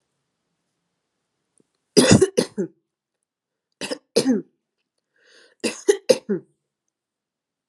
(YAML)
three_cough_length: 7.7 s
three_cough_amplitude: 32768
three_cough_signal_mean_std_ratio: 0.26
survey_phase: alpha (2021-03-01 to 2021-08-12)
age: 18-44
gender: Female
wearing_mask: 'No'
symptom_cough_any: true
symptom_diarrhoea: true
symptom_headache: true
symptom_change_to_sense_of_smell_or_taste: true
symptom_loss_of_taste: true
symptom_onset: 12 days
smoker_status: Ex-smoker
respiratory_condition_asthma: false
respiratory_condition_other: false
recruitment_source: Test and Trace
submission_delay: 2 days
covid_test_result: Positive
covid_test_method: RT-qPCR
covid_ct_value: 17.2
covid_ct_gene: N gene
covid_ct_mean: 18.0
covid_viral_load: 1300000 copies/ml
covid_viral_load_category: High viral load (>1M copies/ml)